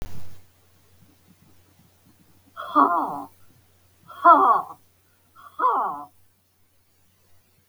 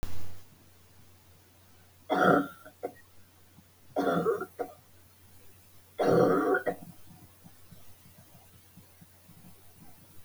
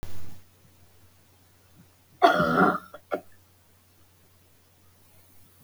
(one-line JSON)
{"exhalation_length": "7.7 s", "exhalation_amplitude": 25052, "exhalation_signal_mean_std_ratio": 0.35, "three_cough_length": "10.2 s", "three_cough_amplitude": 9787, "three_cough_signal_mean_std_ratio": 0.43, "cough_length": "5.6 s", "cough_amplitude": 21025, "cough_signal_mean_std_ratio": 0.35, "survey_phase": "beta (2021-08-13 to 2022-03-07)", "age": "45-64", "gender": "Female", "wearing_mask": "No", "symptom_none": true, "smoker_status": "Never smoked", "respiratory_condition_asthma": true, "respiratory_condition_other": false, "recruitment_source": "REACT", "submission_delay": "4 days", "covid_test_result": "Negative", "covid_test_method": "RT-qPCR", "influenza_a_test_result": "Negative", "influenza_b_test_result": "Negative"}